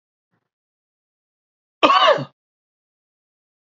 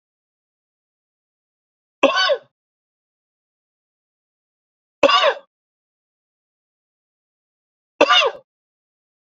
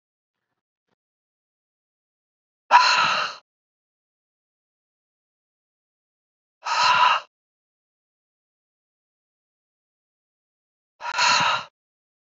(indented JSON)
{
  "cough_length": "3.7 s",
  "cough_amplitude": 27686,
  "cough_signal_mean_std_ratio": 0.25,
  "three_cough_length": "9.3 s",
  "three_cough_amplitude": 32767,
  "three_cough_signal_mean_std_ratio": 0.24,
  "exhalation_length": "12.4 s",
  "exhalation_amplitude": 26474,
  "exhalation_signal_mean_std_ratio": 0.28,
  "survey_phase": "beta (2021-08-13 to 2022-03-07)",
  "age": "45-64",
  "gender": "Male",
  "wearing_mask": "No",
  "symptom_none": true,
  "smoker_status": "Never smoked",
  "respiratory_condition_asthma": false,
  "respiratory_condition_other": false,
  "recruitment_source": "REACT",
  "submission_delay": "2 days",
  "covid_test_result": "Negative",
  "covid_test_method": "RT-qPCR",
  "influenza_a_test_result": "Unknown/Void",
  "influenza_b_test_result": "Unknown/Void"
}